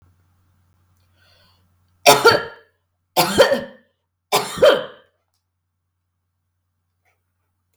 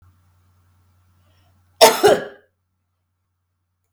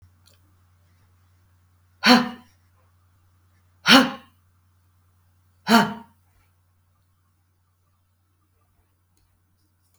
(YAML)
three_cough_length: 7.8 s
three_cough_amplitude: 32768
three_cough_signal_mean_std_ratio: 0.28
cough_length: 3.9 s
cough_amplitude: 32768
cough_signal_mean_std_ratio: 0.23
exhalation_length: 10.0 s
exhalation_amplitude: 31358
exhalation_signal_mean_std_ratio: 0.21
survey_phase: beta (2021-08-13 to 2022-03-07)
age: 45-64
gender: Female
wearing_mask: 'No'
symptom_runny_or_blocked_nose: true
smoker_status: Ex-smoker
respiratory_condition_asthma: false
respiratory_condition_other: false
recruitment_source: REACT
submission_delay: 2 days
covid_test_result: Negative
covid_test_method: RT-qPCR
influenza_a_test_result: Negative
influenza_b_test_result: Negative